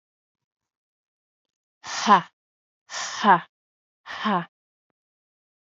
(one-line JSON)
{"exhalation_length": "5.7 s", "exhalation_amplitude": 26667, "exhalation_signal_mean_std_ratio": 0.27, "survey_phase": "beta (2021-08-13 to 2022-03-07)", "age": "18-44", "gender": "Female", "wearing_mask": "No", "symptom_cough_any": true, "symptom_runny_or_blocked_nose": true, "symptom_sore_throat": true, "symptom_abdominal_pain": true, "symptom_fatigue": true, "symptom_fever_high_temperature": true, "symptom_headache": true, "smoker_status": "Never smoked", "respiratory_condition_asthma": false, "respiratory_condition_other": false, "recruitment_source": "Test and Trace", "submission_delay": "1 day", "covid_test_result": "Positive", "covid_test_method": "RT-qPCR", "covid_ct_value": 19.6, "covid_ct_gene": "ORF1ab gene", "covid_ct_mean": 21.0, "covid_viral_load": "130000 copies/ml", "covid_viral_load_category": "Low viral load (10K-1M copies/ml)"}